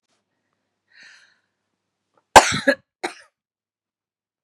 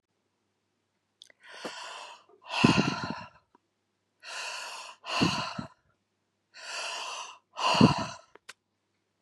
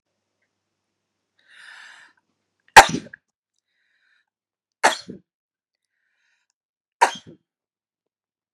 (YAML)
cough_length: 4.4 s
cough_amplitude: 32768
cough_signal_mean_std_ratio: 0.17
exhalation_length: 9.2 s
exhalation_amplitude: 17311
exhalation_signal_mean_std_ratio: 0.36
three_cough_length: 8.5 s
three_cough_amplitude: 32768
three_cough_signal_mean_std_ratio: 0.13
survey_phase: beta (2021-08-13 to 2022-03-07)
age: 45-64
gender: Female
wearing_mask: 'No'
symptom_none: true
smoker_status: Ex-smoker
respiratory_condition_asthma: false
respiratory_condition_other: false
recruitment_source: REACT
submission_delay: 5 days
covid_test_result: Negative
covid_test_method: RT-qPCR
influenza_a_test_result: Negative
influenza_b_test_result: Negative